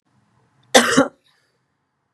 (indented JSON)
{
  "cough_length": "2.1 s",
  "cough_amplitude": 32768,
  "cough_signal_mean_std_ratio": 0.28,
  "survey_phase": "beta (2021-08-13 to 2022-03-07)",
  "age": "45-64",
  "gender": "Female",
  "wearing_mask": "No",
  "symptom_none": true,
  "smoker_status": "Never smoked",
  "respiratory_condition_asthma": false,
  "respiratory_condition_other": false,
  "recruitment_source": "REACT",
  "submission_delay": "2 days",
  "covid_test_result": "Negative",
  "covid_test_method": "RT-qPCR",
  "influenza_a_test_result": "Negative",
  "influenza_b_test_result": "Negative"
}